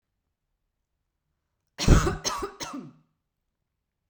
cough_length: 4.1 s
cough_amplitude: 24030
cough_signal_mean_std_ratio: 0.26
survey_phase: beta (2021-08-13 to 2022-03-07)
age: 18-44
gender: Female
wearing_mask: 'No'
symptom_none: true
smoker_status: Never smoked
respiratory_condition_asthma: false
respiratory_condition_other: false
recruitment_source: REACT
submission_delay: 32 days
covid_test_result: Negative
covid_test_method: RT-qPCR
influenza_a_test_result: Negative
influenza_b_test_result: Negative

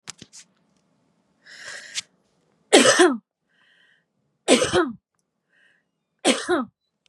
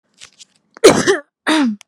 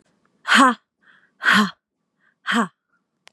three_cough_length: 7.1 s
three_cough_amplitude: 32763
three_cough_signal_mean_std_ratio: 0.32
cough_length: 1.9 s
cough_amplitude: 32768
cough_signal_mean_std_ratio: 0.45
exhalation_length: 3.3 s
exhalation_amplitude: 27462
exhalation_signal_mean_std_ratio: 0.36
survey_phase: beta (2021-08-13 to 2022-03-07)
age: 18-44
gender: Female
wearing_mask: 'No'
symptom_shortness_of_breath: true
symptom_sore_throat: true
symptom_abdominal_pain: true
symptom_fatigue: true
symptom_headache: true
symptom_onset: 12 days
smoker_status: Never smoked
respiratory_condition_asthma: true
respiratory_condition_other: false
recruitment_source: REACT
submission_delay: 1 day
covid_test_result: Negative
covid_test_method: RT-qPCR
influenza_a_test_result: Negative
influenza_b_test_result: Negative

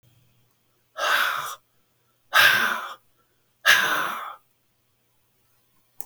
exhalation_length: 6.1 s
exhalation_amplitude: 28429
exhalation_signal_mean_std_ratio: 0.39
survey_phase: beta (2021-08-13 to 2022-03-07)
age: 65+
gender: Male
wearing_mask: 'No'
symptom_none: true
smoker_status: Ex-smoker
respiratory_condition_asthma: false
respiratory_condition_other: false
recruitment_source: REACT
submission_delay: 1 day
covid_test_result: Negative
covid_test_method: RT-qPCR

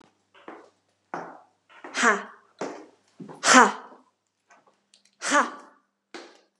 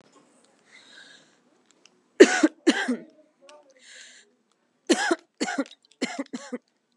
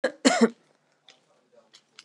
exhalation_length: 6.6 s
exhalation_amplitude: 31974
exhalation_signal_mean_std_ratio: 0.27
three_cough_length: 7.0 s
three_cough_amplitude: 32724
three_cough_signal_mean_std_ratio: 0.26
cough_length: 2.0 s
cough_amplitude: 20398
cough_signal_mean_std_ratio: 0.28
survey_phase: beta (2021-08-13 to 2022-03-07)
age: 18-44
gender: Female
wearing_mask: 'Yes'
symptom_none: true
smoker_status: Never smoked
respiratory_condition_asthma: true
respiratory_condition_other: false
recruitment_source: REACT
submission_delay: 2 days
covid_test_result: Negative
covid_test_method: RT-qPCR
influenza_a_test_result: Negative
influenza_b_test_result: Negative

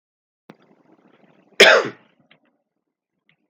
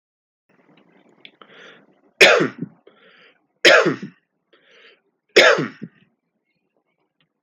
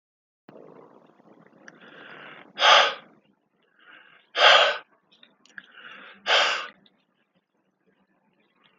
cough_length: 3.5 s
cough_amplitude: 32768
cough_signal_mean_std_ratio: 0.21
three_cough_length: 7.4 s
three_cough_amplitude: 30699
three_cough_signal_mean_std_ratio: 0.28
exhalation_length: 8.8 s
exhalation_amplitude: 25431
exhalation_signal_mean_std_ratio: 0.29
survey_phase: alpha (2021-03-01 to 2021-08-12)
age: 18-44
gender: Male
wearing_mask: 'No'
symptom_cough_any: true
symptom_fatigue: true
symptom_headache: true
symptom_loss_of_taste: true
symptom_onset: 3 days
smoker_status: Never smoked
respiratory_condition_asthma: false
respiratory_condition_other: false
recruitment_source: Test and Trace
submission_delay: 2 days
covid_test_result: Positive
covid_test_method: ePCR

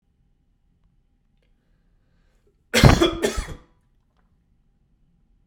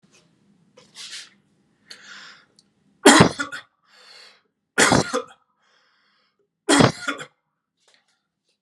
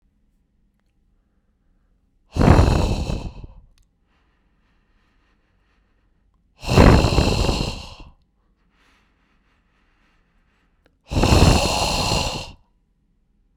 cough_length: 5.5 s
cough_amplitude: 32768
cough_signal_mean_std_ratio: 0.23
three_cough_length: 8.6 s
three_cough_amplitude: 32768
three_cough_signal_mean_std_ratio: 0.26
exhalation_length: 13.6 s
exhalation_amplitude: 32768
exhalation_signal_mean_std_ratio: 0.36
survey_phase: beta (2021-08-13 to 2022-03-07)
age: 18-44
gender: Male
wearing_mask: 'No'
symptom_none: true
smoker_status: Ex-smoker
respiratory_condition_asthma: false
respiratory_condition_other: false
recruitment_source: REACT
submission_delay: 1 day
covid_test_result: Negative
covid_test_method: RT-qPCR
influenza_a_test_result: Unknown/Void
influenza_b_test_result: Unknown/Void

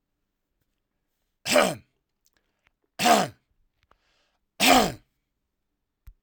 three_cough_length: 6.2 s
three_cough_amplitude: 21556
three_cough_signal_mean_std_ratio: 0.28
survey_phase: alpha (2021-03-01 to 2021-08-12)
age: 45-64
gender: Male
wearing_mask: 'No'
symptom_loss_of_taste: true
symptom_onset: 3 days
smoker_status: Never smoked
respiratory_condition_asthma: false
respiratory_condition_other: false
recruitment_source: Test and Trace
submission_delay: 1 day
covid_test_result: Positive
covid_test_method: RT-qPCR
covid_ct_value: 16.4
covid_ct_gene: ORF1ab gene
covid_ct_mean: 16.8
covid_viral_load: 3100000 copies/ml
covid_viral_load_category: High viral load (>1M copies/ml)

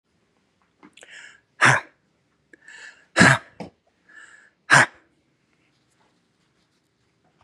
exhalation_length: 7.4 s
exhalation_amplitude: 31035
exhalation_signal_mean_std_ratio: 0.23
survey_phase: beta (2021-08-13 to 2022-03-07)
age: 45-64
gender: Male
wearing_mask: 'No'
symptom_none: true
smoker_status: Never smoked
respiratory_condition_asthma: false
respiratory_condition_other: false
recruitment_source: REACT
submission_delay: 4 days
covid_test_result: Negative
covid_test_method: RT-qPCR
influenza_a_test_result: Negative
influenza_b_test_result: Negative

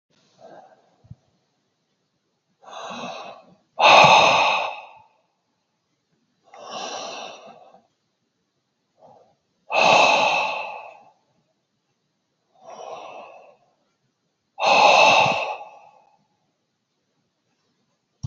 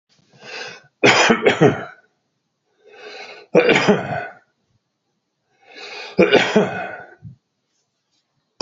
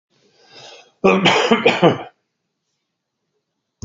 exhalation_length: 18.3 s
exhalation_amplitude: 27974
exhalation_signal_mean_std_ratio: 0.33
three_cough_length: 8.6 s
three_cough_amplitude: 29775
three_cough_signal_mean_std_ratio: 0.39
cough_length: 3.8 s
cough_amplitude: 28481
cough_signal_mean_std_ratio: 0.39
survey_phase: beta (2021-08-13 to 2022-03-07)
age: 65+
gender: Male
wearing_mask: 'No'
symptom_none: true
smoker_status: Ex-smoker
respiratory_condition_asthma: false
respiratory_condition_other: false
recruitment_source: REACT
submission_delay: 2 days
covid_test_result: Negative
covid_test_method: RT-qPCR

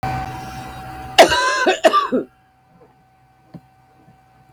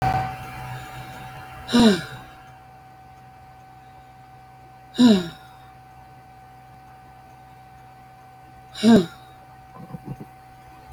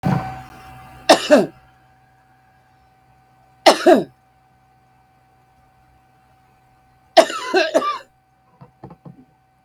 cough_length: 4.5 s
cough_amplitude: 32768
cough_signal_mean_std_ratio: 0.42
exhalation_length: 10.9 s
exhalation_amplitude: 23694
exhalation_signal_mean_std_ratio: 0.35
three_cough_length: 9.6 s
three_cough_amplitude: 32768
three_cough_signal_mean_std_ratio: 0.29
survey_phase: beta (2021-08-13 to 2022-03-07)
age: 45-64
gender: Female
wearing_mask: 'No'
symptom_cough_any: true
symptom_sore_throat: true
symptom_headache: true
symptom_onset: 12 days
smoker_status: Current smoker (11 or more cigarettes per day)
respiratory_condition_asthma: false
respiratory_condition_other: false
recruitment_source: REACT
submission_delay: 2 days
covid_test_result: Negative
covid_test_method: RT-qPCR
influenza_a_test_result: Unknown/Void
influenza_b_test_result: Unknown/Void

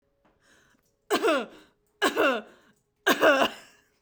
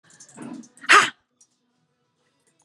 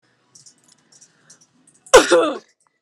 three_cough_length: 4.0 s
three_cough_amplitude: 16985
three_cough_signal_mean_std_ratio: 0.43
exhalation_length: 2.6 s
exhalation_amplitude: 29823
exhalation_signal_mean_std_ratio: 0.23
cough_length: 2.8 s
cough_amplitude: 32768
cough_signal_mean_std_ratio: 0.27
survey_phase: beta (2021-08-13 to 2022-03-07)
age: 18-44
gender: Female
wearing_mask: 'No'
symptom_none: true
symptom_onset: 7 days
smoker_status: Never smoked
respiratory_condition_asthma: false
respiratory_condition_other: false
recruitment_source: REACT
submission_delay: 1 day
covid_test_result: Negative
covid_test_method: RT-qPCR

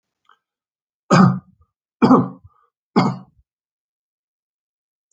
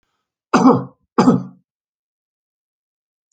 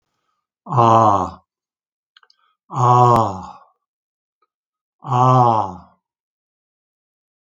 three_cough_length: 5.1 s
three_cough_amplitude: 31589
three_cough_signal_mean_std_ratio: 0.29
cough_length: 3.3 s
cough_amplitude: 29389
cough_signal_mean_std_ratio: 0.31
exhalation_length: 7.4 s
exhalation_amplitude: 28834
exhalation_signal_mean_std_ratio: 0.4
survey_phase: alpha (2021-03-01 to 2021-08-12)
age: 65+
gender: Male
wearing_mask: 'No'
symptom_none: true
smoker_status: Never smoked
respiratory_condition_asthma: false
respiratory_condition_other: false
recruitment_source: REACT
submission_delay: 1 day
covid_test_result: Negative
covid_test_method: RT-qPCR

